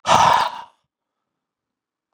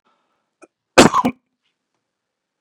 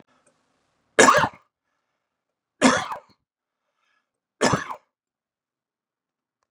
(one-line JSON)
{"exhalation_length": "2.1 s", "exhalation_amplitude": 30878, "exhalation_signal_mean_std_ratio": 0.36, "cough_length": "2.6 s", "cough_amplitude": 32768, "cough_signal_mean_std_ratio": 0.22, "three_cough_length": "6.5 s", "three_cough_amplitude": 28555, "three_cough_signal_mean_std_ratio": 0.25, "survey_phase": "beta (2021-08-13 to 2022-03-07)", "age": "45-64", "gender": "Male", "wearing_mask": "No", "symptom_cough_any": true, "symptom_runny_or_blocked_nose": true, "symptom_sore_throat": true, "smoker_status": "Never smoked", "respiratory_condition_asthma": false, "respiratory_condition_other": false, "recruitment_source": "REACT", "submission_delay": "2 days", "covid_test_result": "Positive", "covid_test_method": "RT-qPCR", "covid_ct_value": 34.0, "covid_ct_gene": "E gene", "influenza_a_test_result": "Negative", "influenza_b_test_result": "Negative"}